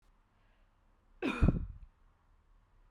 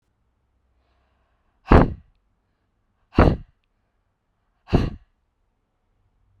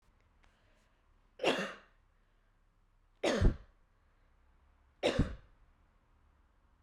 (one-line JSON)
{"cough_length": "2.9 s", "cough_amplitude": 6233, "cough_signal_mean_std_ratio": 0.3, "exhalation_length": "6.4 s", "exhalation_amplitude": 32768, "exhalation_signal_mean_std_ratio": 0.22, "three_cough_length": "6.8 s", "three_cough_amplitude": 6628, "three_cough_signal_mean_std_ratio": 0.28, "survey_phase": "beta (2021-08-13 to 2022-03-07)", "age": "18-44", "gender": "Female", "wearing_mask": "No", "symptom_none": true, "smoker_status": "Never smoked", "respiratory_condition_asthma": false, "respiratory_condition_other": false, "recruitment_source": "REACT", "submission_delay": "2 days", "covid_test_result": "Negative", "covid_test_method": "RT-qPCR", "influenza_a_test_result": "Unknown/Void", "influenza_b_test_result": "Unknown/Void"}